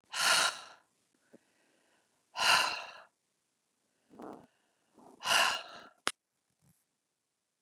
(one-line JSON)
{"exhalation_length": "7.6 s", "exhalation_amplitude": 10219, "exhalation_signal_mean_std_ratio": 0.32, "survey_phase": "beta (2021-08-13 to 2022-03-07)", "age": "45-64", "gender": "Female", "wearing_mask": "No", "symptom_none": true, "smoker_status": "Never smoked", "respiratory_condition_asthma": false, "respiratory_condition_other": false, "recruitment_source": "Test and Trace", "submission_delay": "0 days", "covid_test_result": "Negative", "covid_test_method": "LFT"}